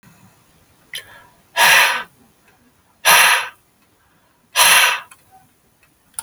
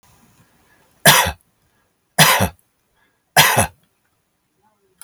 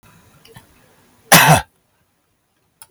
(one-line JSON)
{"exhalation_length": "6.2 s", "exhalation_amplitude": 32768, "exhalation_signal_mean_std_ratio": 0.38, "three_cough_length": "5.0 s", "three_cough_amplitude": 32768, "three_cough_signal_mean_std_ratio": 0.32, "cough_length": "2.9 s", "cough_amplitude": 32768, "cough_signal_mean_std_ratio": 0.27, "survey_phase": "alpha (2021-03-01 to 2021-08-12)", "age": "65+", "gender": "Male", "wearing_mask": "No", "symptom_none": true, "smoker_status": "Never smoked", "respiratory_condition_asthma": false, "respiratory_condition_other": false, "recruitment_source": "REACT", "submission_delay": "1 day", "covid_test_result": "Negative", "covid_test_method": "RT-qPCR"}